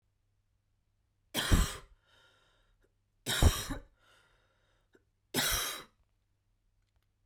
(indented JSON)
{
  "three_cough_length": "7.3 s",
  "three_cough_amplitude": 7496,
  "three_cough_signal_mean_std_ratio": 0.3,
  "survey_phase": "beta (2021-08-13 to 2022-03-07)",
  "age": "18-44",
  "gender": "Female",
  "wearing_mask": "No",
  "symptom_cough_any": true,
  "symptom_runny_or_blocked_nose": true,
  "symptom_fatigue": true,
  "symptom_headache": true,
  "symptom_onset": "3 days",
  "smoker_status": "Ex-smoker",
  "respiratory_condition_asthma": false,
  "respiratory_condition_other": false,
  "recruitment_source": "Test and Trace",
  "submission_delay": "2 days",
  "covid_test_result": "Positive",
  "covid_test_method": "RT-qPCR"
}